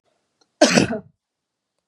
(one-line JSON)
{"cough_length": "1.9 s", "cough_amplitude": 32745, "cough_signal_mean_std_ratio": 0.3, "survey_phase": "beta (2021-08-13 to 2022-03-07)", "age": "45-64", "gender": "Female", "wearing_mask": "No", "symptom_none": true, "symptom_onset": "13 days", "smoker_status": "Never smoked", "respiratory_condition_asthma": false, "respiratory_condition_other": false, "recruitment_source": "REACT", "submission_delay": "1 day", "covid_test_result": "Negative", "covid_test_method": "RT-qPCR", "influenza_a_test_result": "Negative", "influenza_b_test_result": "Negative"}